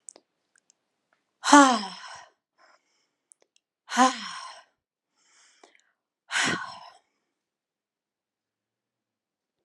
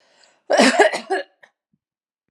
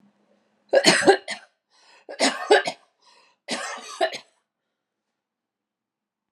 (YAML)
exhalation_length: 9.6 s
exhalation_amplitude: 30875
exhalation_signal_mean_std_ratio: 0.21
cough_length: 2.3 s
cough_amplitude: 29757
cough_signal_mean_std_ratio: 0.39
three_cough_length: 6.3 s
three_cough_amplitude: 28823
three_cough_signal_mean_std_ratio: 0.31
survey_phase: alpha (2021-03-01 to 2021-08-12)
age: 45-64
gender: Female
wearing_mask: 'No'
symptom_none: true
smoker_status: Never smoked
respiratory_condition_asthma: true
respiratory_condition_other: false
recruitment_source: REACT
submission_delay: 1 day
covid_test_result: Negative
covid_test_method: RT-qPCR